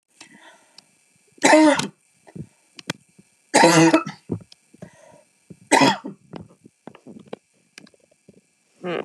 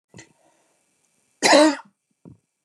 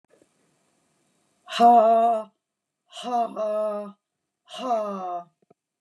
three_cough_length: 9.0 s
three_cough_amplitude: 31960
three_cough_signal_mean_std_ratio: 0.32
cough_length: 2.6 s
cough_amplitude: 26608
cough_signal_mean_std_ratio: 0.29
exhalation_length: 5.8 s
exhalation_amplitude: 15915
exhalation_signal_mean_std_ratio: 0.46
survey_phase: beta (2021-08-13 to 2022-03-07)
age: 45-64
gender: Female
wearing_mask: 'No'
symptom_fatigue: true
symptom_headache: true
symptom_onset: 3 days
smoker_status: Never smoked
respiratory_condition_asthma: false
respiratory_condition_other: false
recruitment_source: Test and Trace
submission_delay: 1 day
covid_test_result: Positive
covid_test_method: RT-qPCR
covid_ct_value: 24.8
covid_ct_gene: N gene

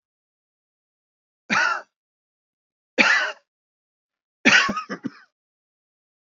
three_cough_length: 6.2 s
three_cough_amplitude: 28365
three_cough_signal_mean_std_ratio: 0.3
survey_phase: beta (2021-08-13 to 2022-03-07)
age: 65+
gender: Male
wearing_mask: 'No'
symptom_diarrhoea: true
symptom_fatigue: true
symptom_onset: 12 days
smoker_status: Never smoked
respiratory_condition_asthma: false
respiratory_condition_other: false
recruitment_source: REACT
submission_delay: 3 days
covid_test_result: Negative
covid_test_method: RT-qPCR
influenza_a_test_result: Negative
influenza_b_test_result: Negative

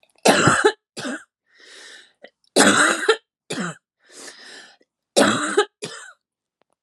three_cough_length: 6.8 s
three_cough_amplitude: 31759
three_cough_signal_mean_std_ratio: 0.41
survey_phase: alpha (2021-03-01 to 2021-08-12)
age: 45-64
gender: Female
wearing_mask: 'No'
symptom_cough_any: true
symptom_shortness_of_breath: true
symptom_headache: true
symptom_onset: 8 days
smoker_status: Current smoker (11 or more cigarettes per day)
respiratory_condition_asthma: false
respiratory_condition_other: false
recruitment_source: Test and Trace
submission_delay: 2 days
covid_test_result: Positive
covid_test_method: RT-qPCR
covid_ct_value: 14.9
covid_ct_gene: N gene
covid_ct_mean: 14.9
covid_viral_load: 13000000 copies/ml
covid_viral_load_category: High viral load (>1M copies/ml)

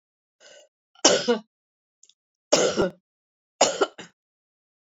three_cough_length: 4.9 s
three_cough_amplitude: 30137
three_cough_signal_mean_std_ratio: 0.32
survey_phase: beta (2021-08-13 to 2022-03-07)
age: 65+
gender: Female
wearing_mask: 'No'
symptom_cough_any: true
symptom_runny_or_blocked_nose: true
symptom_fatigue: true
symptom_headache: true
symptom_change_to_sense_of_smell_or_taste: true
smoker_status: Never smoked
respiratory_condition_asthma: false
respiratory_condition_other: false
recruitment_source: Test and Trace
submission_delay: 1 day
covid_test_result: Positive
covid_test_method: RT-qPCR
covid_ct_value: 14.2
covid_ct_gene: S gene
covid_ct_mean: 14.6
covid_viral_load: 16000000 copies/ml
covid_viral_load_category: High viral load (>1M copies/ml)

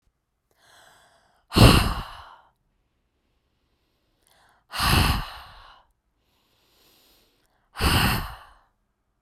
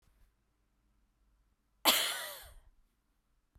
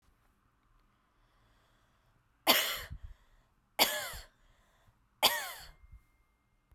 exhalation_length: 9.2 s
exhalation_amplitude: 30538
exhalation_signal_mean_std_ratio: 0.29
cough_length: 3.6 s
cough_amplitude: 13936
cough_signal_mean_std_ratio: 0.26
three_cough_length: 6.7 s
three_cough_amplitude: 10083
three_cough_signal_mean_std_ratio: 0.28
survey_phase: beta (2021-08-13 to 2022-03-07)
age: 18-44
gender: Female
wearing_mask: 'No'
symptom_none: true
smoker_status: Never smoked
respiratory_condition_asthma: false
respiratory_condition_other: false
recruitment_source: REACT
submission_delay: 1 day
covid_test_result: Negative
covid_test_method: RT-qPCR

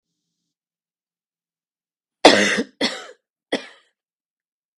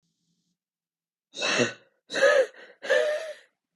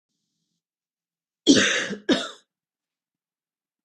three_cough_length: 4.8 s
three_cough_amplitude: 32768
three_cough_signal_mean_std_ratio: 0.23
exhalation_length: 3.8 s
exhalation_amplitude: 12147
exhalation_signal_mean_std_ratio: 0.44
cough_length: 3.8 s
cough_amplitude: 24072
cough_signal_mean_std_ratio: 0.29
survey_phase: beta (2021-08-13 to 2022-03-07)
age: 18-44
gender: Female
wearing_mask: 'No'
symptom_cough_any: true
symptom_runny_or_blocked_nose: true
symptom_diarrhoea: true
symptom_fatigue: true
symptom_headache: true
symptom_change_to_sense_of_smell_or_taste: true
symptom_other: true
symptom_onset: 3 days
smoker_status: Ex-smoker
respiratory_condition_asthma: false
respiratory_condition_other: false
recruitment_source: Test and Trace
submission_delay: 1 day
covid_test_result: Positive
covid_test_method: RT-qPCR
covid_ct_value: 20.8
covid_ct_gene: N gene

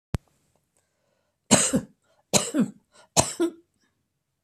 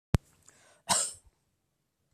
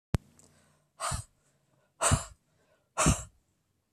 three_cough_length: 4.4 s
three_cough_amplitude: 24430
three_cough_signal_mean_std_ratio: 0.32
cough_length: 2.1 s
cough_amplitude: 16499
cough_signal_mean_std_ratio: 0.24
exhalation_length: 3.9 s
exhalation_amplitude: 11617
exhalation_signal_mean_std_ratio: 0.31
survey_phase: beta (2021-08-13 to 2022-03-07)
age: 65+
gender: Male
wearing_mask: 'No'
symptom_none: true
smoker_status: Never smoked
respiratory_condition_asthma: false
respiratory_condition_other: false
recruitment_source: REACT
submission_delay: 4 days
covid_test_result: Negative
covid_test_method: RT-qPCR
influenza_a_test_result: Negative
influenza_b_test_result: Negative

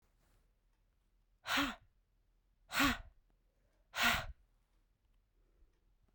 exhalation_length: 6.1 s
exhalation_amplitude: 3974
exhalation_signal_mean_std_ratio: 0.3
survey_phase: beta (2021-08-13 to 2022-03-07)
age: 18-44
gender: Female
wearing_mask: 'No'
symptom_cough_any: true
symptom_new_continuous_cough: true
symptom_runny_or_blocked_nose: true
symptom_sore_throat: true
symptom_fatigue: true
symptom_fever_high_temperature: true
symptom_headache: true
symptom_onset: 3 days
smoker_status: Never smoked
respiratory_condition_asthma: false
respiratory_condition_other: false
recruitment_source: Test and Trace
submission_delay: 1 day
covid_test_result: Positive
covid_test_method: RT-qPCR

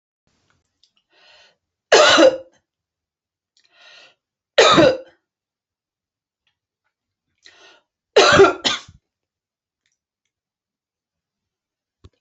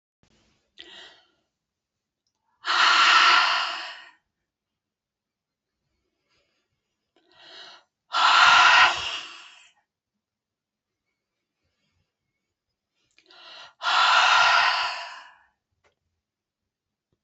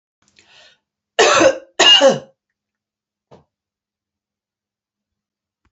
three_cough_length: 12.2 s
three_cough_amplitude: 30829
three_cough_signal_mean_std_ratio: 0.26
exhalation_length: 17.2 s
exhalation_amplitude: 26909
exhalation_signal_mean_std_ratio: 0.36
cough_length: 5.7 s
cough_amplitude: 30405
cough_signal_mean_std_ratio: 0.3
survey_phase: beta (2021-08-13 to 2022-03-07)
age: 45-64
gender: Female
wearing_mask: 'No'
symptom_sore_throat: true
symptom_change_to_sense_of_smell_or_taste: true
symptom_onset: 7 days
smoker_status: Never smoked
respiratory_condition_asthma: false
respiratory_condition_other: false
recruitment_source: Test and Trace
submission_delay: 2 days
covid_test_result: Positive
covid_test_method: RT-qPCR
covid_ct_value: 22.8
covid_ct_gene: ORF1ab gene
covid_ct_mean: 23.1
covid_viral_load: 26000 copies/ml
covid_viral_load_category: Low viral load (10K-1M copies/ml)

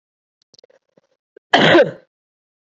cough_length: 2.7 s
cough_amplitude: 30113
cough_signal_mean_std_ratio: 0.3
survey_phase: beta (2021-08-13 to 2022-03-07)
age: 18-44
gender: Female
wearing_mask: 'No'
symptom_cough_any: true
symptom_change_to_sense_of_smell_or_taste: true
symptom_onset: 1 day
smoker_status: Never smoked
respiratory_condition_asthma: false
respiratory_condition_other: false
recruitment_source: Test and Trace
submission_delay: 1 day
covid_test_result: Negative
covid_test_method: RT-qPCR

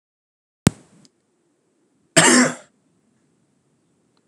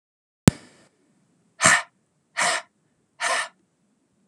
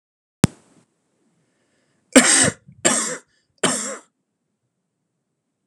cough_length: 4.3 s
cough_amplitude: 32768
cough_signal_mean_std_ratio: 0.24
exhalation_length: 4.3 s
exhalation_amplitude: 32767
exhalation_signal_mean_std_ratio: 0.27
three_cough_length: 5.7 s
three_cough_amplitude: 32768
three_cough_signal_mean_std_ratio: 0.28
survey_phase: beta (2021-08-13 to 2022-03-07)
age: 18-44
gender: Male
wearing_mask: 'No'
symptom_fatigue: true
symptom_fever_high_temperature: true
symptom_headache: true
symptom_onset: 3 days
smoker_status: Never smoked
respiratory_condition_asthma: false
respiratory_condition_other: false
recruitment_source: Test and Trace
submission_delay: 2 days
covid_test_result: Positive
covid_test_method: ePCR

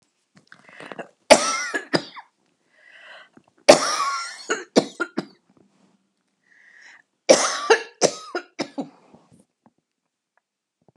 three_cough_length: 11.0 s
three_cough_amplitude: 32768
three_cough_signal_mean_std_ratio: 0.28
survey_phase: beta (2021-08-13 to 2022-03-07)
age: 65+
gender: Female
wearing_mask: 'No'
symptom_runny_or_blocked_nose: true
smoker_status: Never smoked
respiratory_condition_asthma: true
respiratory_condition_other: false
recruitment_source: REACT
submission_delay: 2 days
covid_test_result: Negative
covid_test_method: RT-qPCR
influenza_a_test_result: Negative
influenza_b_test_result: Negative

